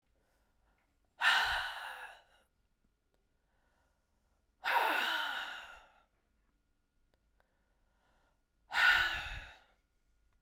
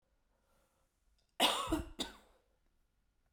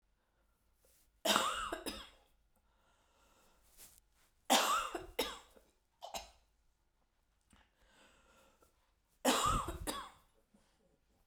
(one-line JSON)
{"exhalation_length": "10.4 s", "exhalation_amplitude": 5572, "exhalation_signal_mean_std_ratio": 0.36, "cough_length": "3.3 s", "cough_amplitude": 5426, "cough_signal_mean_std_ratio": 0.31, "three_cough_length": "11.3 s", "three_cough_amplitude": 7534, "three_cough_signal_mean_std_ratio": 0.34, "survey_phase": "beta (2021-08-13 to 2022-03-07)", "age": "45-64", "gender": "Female", "wearing_mask": "No", "symptom_cough_any": true, "symptom_sore_throat": true, "symptom_abdominal_pain": true, "symptom_fatigue": true, "symptom_headache": true, "symptom_change_to_sense_of_smell_or_taste": true, "symptom_other": true, "symptom_onset": "2 days", "smoker_status": "Never smoked", "respiratory_condition_asthma": false, "respiratory_condition_other": false, "recruitment_source": "Test and Trace", "submission_delay": "2 days", "covid_test_result": "Positive", "covid_test_method": "RT-qPCR", "covid_ct_value": 25.3, "covid_ct_gene": "ORF1ab gene", "covid_ct_mean": 26.3, "covid_viral_load": "2400 copies/ml", "covid_viral_load_category": "Minimal viral load (< 10K copies/ml)"}